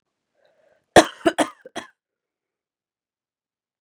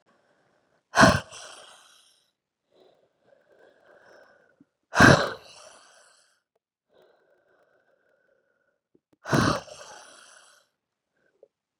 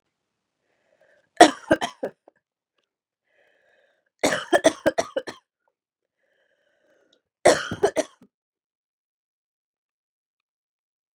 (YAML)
cough_length: 3.8 s
cough_amplitude: 32768
cough_signal_mean_std_ratio: 0.17
exhalation_length: 11.8 s
exhalation_amplitude: 31211
exhalation_signal_mean_std_ratio: 0.2
three_cough_length: 11.1 s
three_cough_amplitude: 32768
three_cough_signal_mean_std_ratio: 0.2
survey_phase: beta (2021-08-13 to 2022-03-07)
age: 18-44
gender: Female
wearing_mask: 'No'
symptom_runny_or_blocked_nose: true
symptom_shortness_of_breath: true
symptom_sore_throat: true
symptom_fatigue: true
symptom_headache: true
symptom_onset: 2 days
smoker_status: Never smoked
respiratory_condition_asthma: false
respiratory_condition_other: false
recruitment_source: Test and Trace
submission_delay: 1 day
covid_test_result: Positive
covid_test_method: RT-qPCR